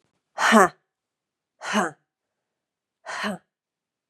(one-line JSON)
{"exhalation_length": "4.1 s", "exhalation_amplitude": 31321, "exhalation_signal_mean_std_ratio": 0.28, "survey_phase": "beta (2021-08-13 to 2022-03-07)", "age": "45-64", "gender": "Female", "wearing_mask": "No", "symptom_cough_any": true, "symptom_runny_or_blocked_nose": true, "symptom_shortness_of_breath": true, "symptom_sore_throat": true, "symptom_abdominal_pain": true, "symptom_diarrhoea": true, "symptom_fatigue": true, "symptom_fever_high_temperature": true, "symptom_headache": true, "symptom_change_to_sense_of_smell_or_taste": true, "symptom_loss_of_taste": true, "smoker_status": "Ex-smoker", "respiratory_condition_asthma": true, "respiratory_condition_other": false, "recruitment_source": "Test and Trace", "submission_delay": "3 days", "covid_test_result": "Positive", "covid_test_method": "ePCR"}